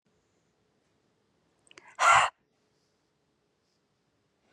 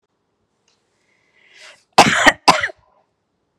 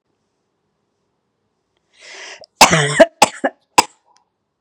exhalation_length: 4.5 s
exhalation_amplitude: 12885
exhalation_signal_mean_std_ratio: 0.2
cough_length: 3.6 s
cough_amplitude: 32768
cough_signal_mean_std_ratio: 0.27
three_cough_length: 4.6 s
three_cough_amplitude: 32768
three_cough_signal_mean_std_ratio: 0.26
survey_phase: beta (2021-08-13 to 2022-03-07)
age: 45-64
gender: Female
wearing_mask: 'No'
symptom_cough_any: true
symptom_runny_or_blocked_nose: true
symptom_sore_throat: true
symptom_abdominal_pain: true
symptom_fatigue: true
symptom_headache: true
symptom_change_to_sense_of_smell_or_taste: true
symptom_loss_of_taste: true
symptom_other: true
smoker_status: Never smoked
respiratory_condition_asthma: true
respiratory_condition_other: false
recruitment_source: Test and Trace
submission_delay: 2 days
covid_test_result: Positive
covid_test_method: LFT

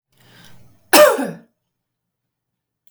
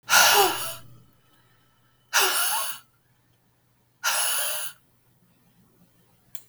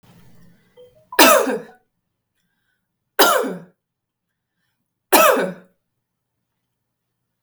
cough_length: 2.9 s
cough_amplitude: 32768
cough_signal_mean_std_ratio: 0.27
exhalation_length: 6.5 s
exhalation_amplitude: 19357
exhalation_signal_mean_std_ratio: 0.43
three_cough_length: 7.4 s
three_cough_amplitude: 32768
three_cough_signal_mean_std_ratio: 0.3
survey_phase: beta (2021-08-13 to 2022-03-07)
age: 45-64
gender: Female
wearing_mask: 'No'
symptom_none: true
smoker_status: Never smoked
respiratory_condition_asthma: false
respiratory_condition_other: false
recruitment_source: REACT
submission_delay: 1 day
covid_test_result: Negative
covid_test_method: RT-qPCR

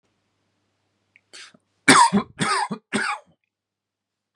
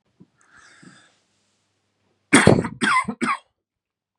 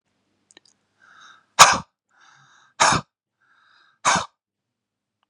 three_cough_length: 4.4 s
three_cough_amplitude: 32767
three_cough_signal_mean_std_ratio: 0.32
cough_length: 4.2 s
cough_amplitude: 32768
cough_signal_mean_std_ratio: 0.3
exhalation_length: 5.3 s
exhalation_amplitude: 32768
exhalation_signal_mean_std_ratio: 0.23
survey_phase: beta (2021-08-13 to 2022-03-07)
age: 45-64
gender: Male
wearing_mask: 'No'
symptom_none: true
smoker_status: Never smoked
respiratory_condition_asthma: false
respiratory_condition_other: false
recruitment_source: REACT
submission_delay: 2 days
covid_test_result: Negative
covid_test_method: RT-qPCR
influenza_a_test_result: Negative
influenza_b_test_result: Negative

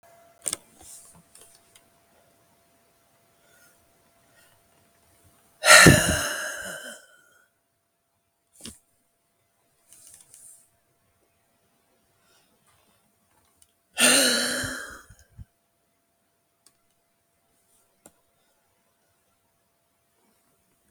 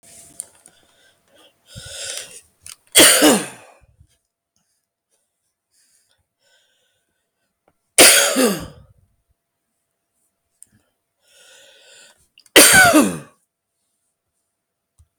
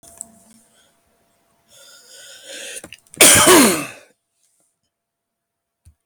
exhalation_length: 20.9 s
exhalation_amplitude: 32768
exhalation_signal_mean_std_ratio: 0.2
three_cough_length: 15.2 s
three_cough_amplitude: 32768
three_cough_signal_mean_std_ratio: 0.27
cough_length: 6.1 s
cough_amplitude: 32768
cough_signal_mean_std_ratio: 0.29
survey_phase: beta (2021-08-13 to 2022-03-07)
age: 45-64
gender: Male
wearing_mask: 'No'
symptom_cough_any: true
smoker_status: Ex-smoker
respiratory_condition_asthma: false
respiratory_condition_other: false
recruitment_source: REACT
submission_delay: 3 days
covid_test_result: Negative
covid_test_method: RT-qPCR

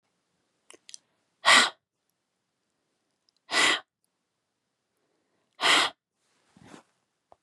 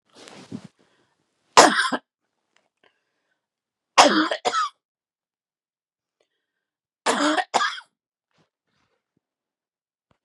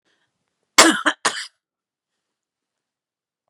exhalation_length: 7.4 s
exhalation_amplitude: 18396
exhalation_signal_mean_std_ratio: 0.25
three_cough_length: 10.2 s
three_cough_amplitude: 32768
three_cough_signal_mean_std_ratio: 0.26
cough_length: 3.5 s
cough_amplitude: 32768
cough_signal_mean_std_ratio: 0.23
survey_phase: beta (2021-08-13 to 2022-03-07)
age: 45-64
gender: Female
wearing_mask: 'No'
symptom_none: true
smoker_status: Never smoked
respiratory_condition_asthma: false
respiratory_condition_other: false
recruitment_source: REACT
submission_delay: 1 day
covid_test_result: Negative
covid_test_method: RT-qPCR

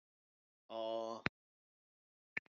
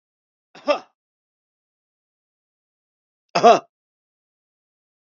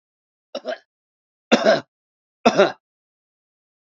exhalation_length: 2.6 s
exhalation_amplitude: 6998
exhalation_signal_mean_std_ratio: 0.31
cough_length: 5.1 s
cough_amplitude: 28545
cough_signal_mean_std_ratio: 0.18
three_cough_length: 3.9 s
three_cough_amplitude: 27444
three_cough_signal_mean_std_ratio: 0.28
survey_phase: beta (2021-08-13 to 2022-03-07)
age: 45-64
gender: Male
wearing_mask: 'No'
symptom_none: true
smoker_status: Never smoked
respiratory_condition_asthma: false
respiratory_condition_other: false
recruitment_source: REACT
submission_delay: 1 day
covid_test_result: Negative
covid_test_method: RT-qPCR
influenza_a_test_result: Negative
influenza_b_test_result: Negative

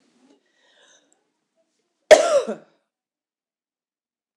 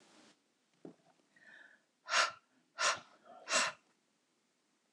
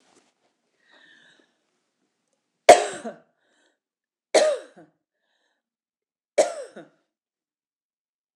cough_length: 4.4 s
cough_amplitude: 26028
cough_signal_mean_std_ratio: 0.19
exhalation_length: 4.9 s
exhalation_amplitude: 5908
exhalation_signal_mean_std_ratio: 0.31
three_cough_length: 8.4 s
three_cough_amplitude: 26028
three_cough_signal_mean_std_ratio: 0.18
survey_phase: beta (2021-08-13 to 2022-03-07)
age: 45-64
gender: Female
wearing_mask: 'No'
symptom_cough_any: true
smoker_status: Ex-smoker
respiratory_condition_asthma: false
respiratory_condition_other: false
recruitment_source: REACT
submission_delay: 1 day
covid_test_result: Negative
covid_test_method: RT-qPCR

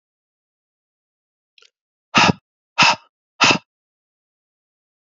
exhalation_length: 5.1 s
exhalation_amplitude: 32768
exhalation_signal_mean_std_ratio: 0.25
survey_phase: beta (2021-08-13 to 2022-03-07)
age: 18-44
gender: Male
wearing_mask: 'No'
symptom_cough_any: true
symptom_runny_or_blocked_nose: true
symptom_fatigue: true
symptom_onset: 3 days
smoker_status: Never smoked
respiratory_condition_asthma: false
respiratory_condition_other: false
recruitment_source: Test and Trace
submission_delay: 2 days
covid_test_result: Positive
covid_test_method: RT-qPCR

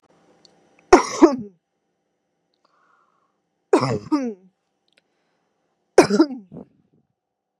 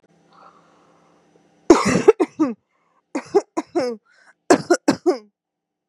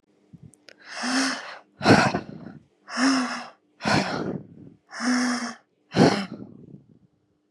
three_cough_length: 7.6 s
three_cough_amplitude: 32768
three_cough_signal_mean_std_ratio: 0.25
cough_length: 5.9 s
cough_amplitude: 32768
cough_signal_mean_std_ratio: 0.33
exhalation_length: 7.5 s
exhalation_amplitude: 24555
exhalation_signal_mean_std_ratio: 0.48
survey_phase: beta (2021-08-13 to 2022-03-07)
age: 18-44
gender: Female
wearing_mask: 'Yes'
symptom_none: true
smoker_status: Never smoked
respiratory_condition_asthma: false
respiratory_condition_other: false
recruitment_source: REACT
submission_delay: 2 days
covid_test_result: Negative
covid_test_method: RT-qPCR
influenza_a_test_result: Unknown/Void
influenza_b_test_result: Unknown/Void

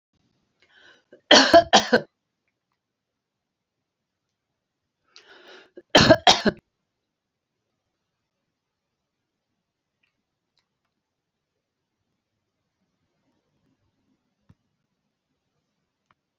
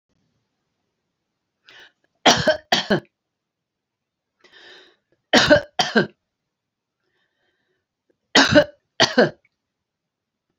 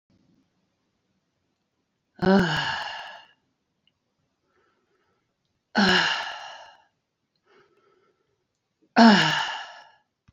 cough_length: 16.4 s
cough_amplitude: 32767
cough_signal_mean_std_ratio: 0.17
three_cough_length: 10.6 s
three_cough_amplitude: 32349
three_cough_signal_mean_std_ratio: 0.28
exhalation_length: 10.3 s
exhalation_amplitude: 25098
exhalation_signal_mean_std_ratio: 0.3
survey_phase: alpha (2021-03-01 to 2021-08-12)
age: 65+
gender: Female
wearing_mask: 'No'
symptom_none: true
smoker_status: Ex-smoker
respiratory_condition_asthma: false
respiratory_condition_other: false
recruitment_source: REACT
submission_delay: 1 day
covid_test_result: Negative
covid_test_method: RT-qPCR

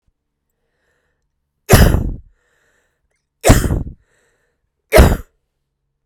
three_cough_length: 6.1 s
three_cough_amplitude: 32768
three_cough_signal_mean_std_ratio: 0.31
survey_phase: beta (2021-08-13 to 2022-03-07)
age: 45-64
gender: Female
wearing_mask: 'No'
symptom_cough_any: true
symptom_sore_throat: true
symptom_fatigue: true
symptom_headache: true
symptom_change_to_sense_of_smell_or_taste: true
symptom_onset: 7 days
smoker_status: Ex-smoker
respiratory_condition_asthma: false
respiratory_condition_other: false
recruitment_source: Test and Trace
submission_delay: 2 days
covid_test_result: Positive
covid_test_method: RT-qPCR
covid_ct_value: 17.5
covid_ct_gene: ORF1ab gene
covid_ct_mean: 17.7
covid_viral_load: 1600000 copies/ml
covid_viral_load_category: High viral load (>1M copies/ml)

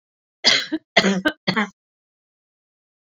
three_cough_length: 3.1 s
three_cough_amplitude: 28751
three_cough_signal_mean_std_ratio: 0.37
survey_phase: beta (2021-08-13 to 2022-03-07)
age: 45-64
gender: Female
wearing_mask: 'No'
symptom_cough_any: true
symptom_onset: 12 days
smoker_status: Never smoked
respiratory_condition_asthma: false
respiratory_condition_other: false
recruitment_source: REACT
submission_delay: 2 days
covid_test_result: Negative
covid_test_method: RT-qPCR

